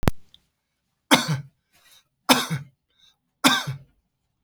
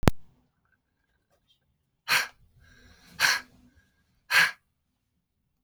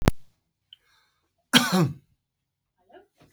{"three_cough_length": "4.4 s", "three_cough_amplitude": 32768, "three_cough_signal_mean_std_ratio": 0.33, "exhalation_length": "5.6 s", "exhalation_amplitude": 32768, "exhalation_signal_mean_std_ratio": 0.28, "cough_length": "3.3 s", "cough_amplitude": 32767, "cough_signal_mean_std_ratio": 0.29, "survey_phase": "beta (2021-08-13 to 2022-03-07)", "age": "65+", "gender": "Male", "wearing_mask": "No", "symptom_none": true, "smoker_status": "Never smoked", "respiratory_condition_asthma": false, "respiratory_condition_other": false, "recruitment_source": "REACT", "submission_delay": "2 days", "covid_test_result": "Negative", "covid_test_method": "RT-qPCR", "influenza_a_test_result": "Negative", "influenza_b_test_result": "Negative"}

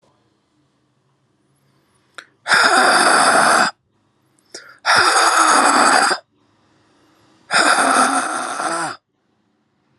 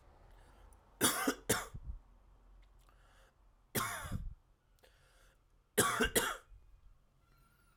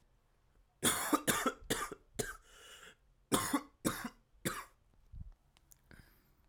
{"exhalation_length": "10.0 s", "exhalation_amplitude": 32510, "exhalation_signal_mean_std_ratio": 0.54, "three_cough_length": "7.8 s", "three_cough_amplitude": 5454, "three_cough_signal_mean_std_ratio": 0.38, "cough_length": "6.5 s", "cough_amplitude": 6826, "cough_signal_mean_std_ratio": 0.4, "survey_phase": "alpha (2021-03-01 to 2021-08-12)", "age": "18-44", "gender": "Male", "wearing_mask": "No", "symptom_cough_any": true, "symptom_abdominal_pain": true, "symptom_fatigue": true, "symptom_fever_high_temperature": true, "symptom_headache": true, "symptom_change_to_sense_of_smell_or_taste": true, "smoker_status": "Never smoked", "respiratory_condition_asthma": false, "respiratory_condition_other": false, "recruitment_source": "Test and Trace", "submission_delay": "2 days", "covid_test_result": "Positive", "covid_test_method": "RT-qPCR", "covid_ct_value": 15.7, "covid_ct_gene": "ORF1ab gene"}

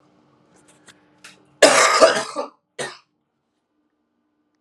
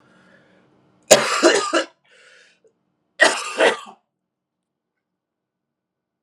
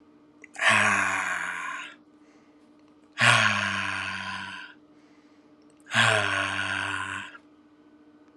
{"cough_length": "4.6 s", "cough_amplitude": 32768, "cough_signal_mean_std_ratio": 0.3, "three_cough_length": "6.2 s", "three_cough_amplitude": 32768, "three_cough_signal_mean_std_ratio": 0.31, "exhalation_length": "8.4 s", "exhalation_amplitude": 19682, "exhalation_signal_mean_std_ratio": 0.53, "survey_phase": "alpha (2021-03-01 to 2021-08-12)", "age": "18-44", "gender": "Male", "wearing_mask": "No", "symptom_cough_any": true, "symptom_new_continuous_cough": true, "symptom_shortness_of_breath": true, "symptom_abdominal_pain": true, "symptom_headache": true, "symptom_change_to_sense_of_smell_or_taste": true, "symptom_loss_of_taste": true, "smoker_status": "Ex-smoker", "respiratory_condition_asthma": false, "respiratory_condition_other": false, "recruitment_source": "Test and Trace", "submission_delay": "1 day", "covid_test_result": "Positive", "covid_test_method": "RT-qPCR", "covid_ct_value": 16.3, "covid_ct_gene": "ORF1ab gene", "covid_ct_mean": 16.6, "covid_viral_load": "3600000 copies/ml", "covid_viral_load_category": "High viral load (>1M copies/ml)"}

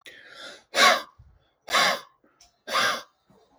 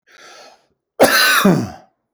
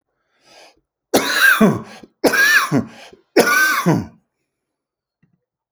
{"exhalation_length": "3.6 s", "exhalation_amplitude": 20569, "exhalation_signal_mean_std_ratio": 0.39, "cough_length": "2.1 s", "cough_amplitude": 31927, "cough_signal_mean_std_ratio": 0.48, "three_cough_length": "5.7 s", "three_cough_amplitude": 28568, "three_cough_signal_mean_std_ratio": 0.48, "survey_phase": "beta (2021-08-13 to 2022-03-07)", "age": "45-64", "gender": "Male", "wearing_mask": "No", "symptom_none": true, "smoker_status": "Ex-smoker", "respiratory_condition_asthma": false, "respiratory_condition_other": false, "recruitment_source": "REACT", "submission_delay": "2 days", "covid_test_result": "Negative", "covid_test_method": "RT-qPCR"}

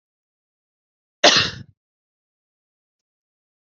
{"cough_length": "3.8 s", "cough_amplitude": 28665, "cough_signal_mean_std_ratio": 0.2, "survey_phase": "beta (2021-08-13 to 2022-03-07)", "age": "45-64", "gender": "Female", "wearing_mask": "No", "symptom_cough_any": true, "symptom_new_continuous_cough": true, "symptom_runny_or_blocked_nose": true, "symptom_sore_throat": true, "symptom_abdominal_pain": true, "symptom_fatigue": true, "symptom_headache": true, "symptom_change_to_sense_of_smell_or_taste": true, "symptom_onset": "3 days", "smoker_status": "Ex-smoker", "respiratory_condition_asthma": true, "respiratory_condition_other": false, "recruitment_source": "Test and Trace", "submission_delay": "2 days", "covid_test_result": "Positive", "covid_test_method": "RT-qPCR", "covid_ct_value": 34.8, "covid_ct_gene": "ORF1ab gene"}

